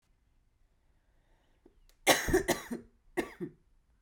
cough_length: 4.0 s
cough_amplitude: 12835
cough_signal_mean_std_ratio: 0.3
survey_phase: beta (2021-08-13 to 2022-03-07)
age: 65+
gender: Female
wearing_mask: 'Yes'
symptom_cough_any: true
symptom_new_continuous_cough: true
symptom_runny_or_blocked_nose: true
symptom_shortness_of_breath: true
symptom_sore_throat: true
symptom_fatigue: true
symptom_fever_high_temperature: true
symptom_headache: true
symptom_change_to_sense_of_smell_or_taste: true
symptom_onset: 3 days
smoker_status: Current smoker (1 to 10 cigarettes per day)
respiratory_condition_asthma: false
respiratory_condition_other: false
recruitment_source: Test and Trace
submission_delay: 2 days
covid_test_result: Positive
covid_test_method: ePCR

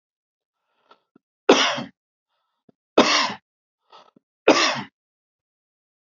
three_cough_length: 6.1 s
three_cough_amplitude: 32767
three_cough_signal_mean_std_ratio: 0.28
survey_phase: beta (2021-08-13 to 2022-03-07)
age: 45-64
gender: Male
wearing_mask: 'No'
symptom_cough_any: true
symptom_runny_or_blocked_nose: true
symptom_fatigue: true
symptom_onset: 3 days
smoker_status: Never smoked
respiratory_condition_asthma: false
respiratory_condition_other: false
recruitment_source: Test and Trace
submission_delay: 2 days
covid_test_result: Positive
covid_test_method: RT-qPCR
covid_ct_value: 17.9
covid_ct_gene: ORF1ab gene
covid_ct_mean: 18.5
covid_viral_load: 850000 copies/ml
covid_viral_load_category: Low viral load (10K-1M copies/ml)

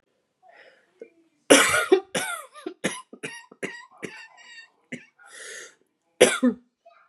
cough_length: 7.1 s
cough_amplitude: 31934
cough_signal_mean_std_ratio: 0.31
survey_phase: beta (2021-08-13 to 2022-03-07)
age: 18-44
gender: Female
wearing_mask: 'No'
symptom_cough_any: true
symptom_new_continuous_cough: true
symptom_runny_or_blocked_nose: true
symptom_sore_throat: true
symptom_fatigue: true
symptom_headache: true
symptom_change_to_sense_of_smell_or_taste: true
symptom_other: true
symptom_onset: 3 days
smoker_status: Never smoked
respiratory_condition_asthma: true
respiratory_condition_other: false
recruitment_source: Test and Trace
submission_delay: 1 day
covid_test_result: Positive
covid_test_method: RT-qPCR
covid_ct_value: 19.9
covid_ct_gene: N gene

